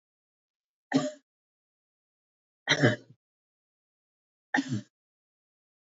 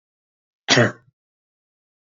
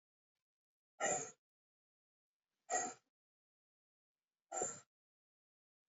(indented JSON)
{
  "three_cough_length": "5.8 s",
  "three_cough_amplitude": 11683,
  "three_cough_signal_mean_std_ratio": 0.24,
  "cough_length": "2.1 s",
  "cough_amplitude": 27890,
  "cough_signal_mean_std_ratio": 0.24,
  "exhalation_length": "5.9 s",
  "exhalation_amplitude": 1777,
  "exhalation_signal_mean_std_ratio": 0.27,
  "survey_phase": "beta (2021-08-13 to 2022-03-07)",
  "age": "45-64",
  "gender": "Female",
  "wearing_mask": "No",
  "symptom_cough_any": true,
  "symptom_runny_or_blocked_nose": true,
  "smoker_status": "Never smoked",
  "respiratory_condition_asthma": false,
  "respiratory_condition_other": false,
  "recruitment_source": "REACT",
  "submission_delay": "1 day",
  "covid_test_result": "Negative",
  "covid_test_method": "RT-qPCR"
}